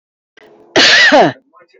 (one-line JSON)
{"cough_length": "1.8 s", "cough_amplitude": 30820, "cough_signal_mean_std_ratio": 0.53, "survey_phase": "beta (2021-08-13 to 2022-03-07)", "age": "45-64", "gender": "Female", "wearing_mask": "No", "symptom_none": true, "smoker_status": "Ex-smoker", "respiratory_condition_asthma": false, "respiratory_condition_other": false, "recruitment_source": "REACT", "submission_delay": "2 days", "covid_test_result": "Negative", "covid_test_method": "RT-qPCR", "influenza_a_test_result": "Negative", "influenza_b_test_result": "Negative"}